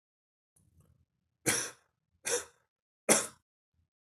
{
  "three_cough_length": "4.0 s",
  "three_cough_amplitude": 11456,
  "three_cough_signal_mean_std_ratio": 0.27,
  "survey_phase": "beta (2021-08-13 to 2022-03-07)",
  "age": "18-44",
  "gender": "Male",
  "wearing_mask": "No",
  "symptom_none": true,
  "symptom_onset": "6 days",
  "smoker_status": "Never smoked",
  "respiratory_condition_asthma": false,
  "respiratory_condition_other": false,
  "recruitment_source": "Test and Trace",
  "submission_delay": "2 days",
  "covid_test_result": "Positive",
  "covid_test_method": "RT-qPCR",
  "covid_ct_value": 15.8,
  "covid_ct_gene": "ORF1ab gene",
  "covid_ct_mean": 16.0,
  "covid_viral_load": "5700000 copies/ml",
  "covid_viral_load_category": "High viral load (>1M copies/ml)"
}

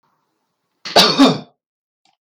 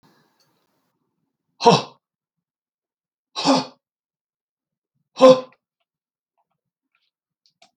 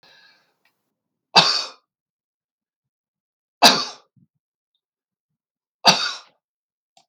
{
  "cough_length": "2.2 s",
  "cough_amplitude": 32768,
  "cough_signal_mean_std_ratio": 0.35,
  "exhalation_length": "7.8 s",
  "exhalation_amplitude": 32766,
  "exhalation_signal_mean_std_ratio": 0.2,
  "three_cough_length": "7.1 s",
  "three_cough_amplitude": 32768,
  "three_cough_signal_mean_std_ratio": 0.23,
  "survey_phase": "beta (2021-08-13 to 2022-03-07)",
  "age": "65+",
  "gender": "Male",
  "wearing_mask": "No",
  "symptom_none": true,
  "smoker_status": "Ex-smoker",
  "respiratory_condition_asthma": true,
  "respiratory_condition_other": false,
  "recruitment_source": "REACT",
  "submission_delay": "3 days",
  "covid_test_result": "Negative",
  "covid_test_method": "RT-qPCR"
}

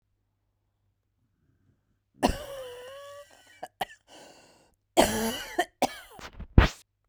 {
  "cough_length": "7.1 s",
  "cough_amplitude": 26476,
  "cough_signal_mean_std_ratio": 0.27,
  "survey_phase": "beta (2021-08-13 to 2022-03-07)",
  "age": "45-64",
  "gender": "Female",
  "wearing_mask": "No",
  "symptom_fatigue": true,
  "smoker_status": "Ex-smoker",
  "respiratory_condition_asthma": false,
  "respiratory_condition_other": true,
  "recruitment_source": "REACT",
  "submission_delay": "16 days",
  "covid_test_result": "Negative",
  "covid_test_method": "RT-qPCR",
  "influenza_a_test_result": "Negative",
  "influenza_b_test_result": "Negative"
}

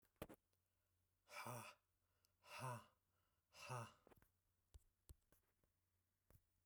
{
  "exhalation_length": "6.7 s",
  "exhalation_amplitude": 438,
  "exhalation_signal_mean_std_ratio": 0.37,
  "survey_phase": "beta (2021-08-13 to 2022-03-07)",
  "age": "18-44",
  "gender": "Male",
  "wearing_mask": "No",
  "symptom_none": true,
  "smoker_status": "Ex-smoker",
  "respiratory_condition_asthma": false,
  "respiratory_condition_other": false,
  "recruitment_source": "REACT",
  "submission_delay": "0 days",
  "covid_test_result": "Negative",
  "covid_test_method": "RT-qPCR"
}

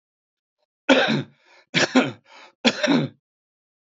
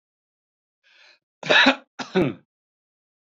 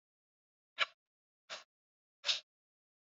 {
  "three_cough_length": "3.9 s",
  "three_cough_amplitude": 27077,
  "three_cough_signal_mean_std_ratio": 0.4,
  "cough_length": "3.2 s",
  "cough_amplitude": 29065,
  "cough_signal_mean_std_ratio": 0.3,
  "exhalation_length": "3.2 s",
  "exhalation_amplitude": 3919,
  "exhalation_signal_mean_std_ratio": 0.2,
  "survey_phase": "beta (2021-08-13 to 2022-03-07)",
  "age": "65+",
  "gender": "Male",
  "wearing_mask": "No",
  "symptom_none": true,
  "smoker_status": "Ex-smoker",
  "respiratory_condition_asthma": false,
  "respiratory_condition_other": false,
  "recruitment_source": "REACT",
  "submission_delay": "1 day",
  "covid_test_result": "Negative",
  "covid_test_method": "RT-qPCR",
  "influenza_a_test_result": "Negative",
  "influenza_b_test_result": "Negative"
}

